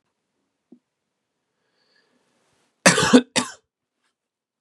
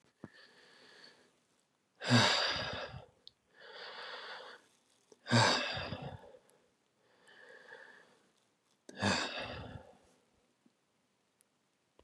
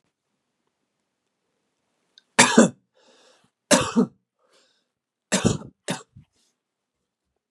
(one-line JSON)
{"cough_length": "4.6 s", "cough_amplitude": 32768, "cough_signal_mean_std_ratio": 0.21, "exhalation_length": "12.0 s", "exhalation_amplitude": 6564, "exhalation_signal_mean_std_ratio": 0.35, "three_cough_length": "7.5 s", "three_cough_amplitude": 32767, "three_cough_signal_mean_std_ratio": 0.24, "survey_phase": "beta (2021-08-13 to 2022-03-07)", "age": "18-44", "gender": "Male", "wearing_mask": "No", "symptom_cough_any": true, "symptom_runny_or_blocked_nose": true, "symptom_sore_throat": true, "symptom_fatigue": true, "symptom_fever_high_temperature": true, "symptom_onset": "2 days", "smoker_status": "Never smoked", "respiratory_condition_asthma": false, "respiratory_condition_other": false, "recruitment_source": "Test and Trace", "submission_delay": "1 day", "covid_test_result": "Positive", "covid_test_method": "RT-qPCR", "covid_ct_value": 15.5, "covid_ct_gene": "N gene"}